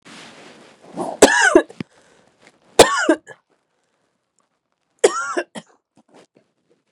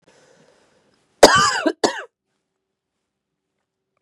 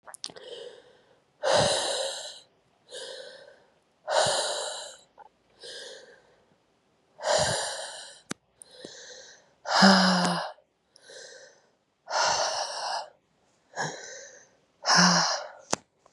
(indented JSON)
{
  "three_cough_length": "6.9 s",
  "three_cough_amplitude": 32768,
  "three_cough_signal_mean_std_ratio": 0.29,
  "cough_length": "4.0 s",
  "cough_amplitude": 32768,
  "cough_signal_mean_std_ratio": 0.25,
  "exhalation_length": "16.1 s",
  "exhalation_amplitude": 20545,
  "exhalation_signal_mean_std_ratio": 0.44,
  "survey_phase": "beta (2021-08-13 to 2022-03-07)",
  "age": "18-44",
  "gender": "Female",
  "wearing_mask": "No",
  "symptom_cough_any": true,
  "symptom_runny_or_blocked_nose": true,
  "symptom_shortness_of_breath": true,
  "symptom_diarrhoea": true,
  "symptom_fatigue": true,
  "symptom_fever_high_temperature": true,
  "symptom_headache": true,
  "symptom_onset": "3 days",
  "smoker_status": "Never smoked",
  "respiratory_condition_asthma": true,
  "respiratory_condition_other": false,
  "recruitment_source": "Test and Trace",
  "submission_delay": "1 day",
  "covid_test_result": "Positive",
  "covid_test_method": "RT-qPCR",
  "covid_ct_value": 16.7,
  "covid_ct_gene": "ORF1ab gene",
  "covid_ct_mean": 17.1,
  "covid_viral_load": "2400000 copies/ml",
  "covid_viral_load_category": "High viral load (>1M copies/ml)"
}